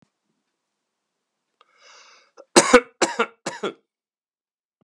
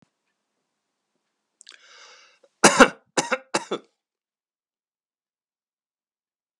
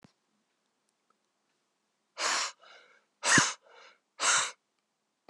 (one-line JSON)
{"three_cough_length": "4.8 s", "three_cough_amplitude": 32768, "three_cough_signal_mean_std_ratio": 0.21, "cough_length": "6.6 s", "cough_amplitude": 32767, "cough_signal_mean_std_ratio": 0.17, "exhalation_length": "5.3 s", "exhalation_amplitude": 11334, "exhalation_signal_mean_std_ratio": 0.32, "survey_phase": "beta (2021-08-13 to 2022-03-07)", "age": "65+", "gender": "Male", "wearing_mask": "No", "symptom_none": true, "smoker_status": "Never smoked", "respiratory_condition_asthma": false, "respiratory_condition_other": false, "recruitment_source": "REACT", "submission_delay": "4 days", "covid_test_result": "Negative", "covid_test_method": "RT-qPCR"}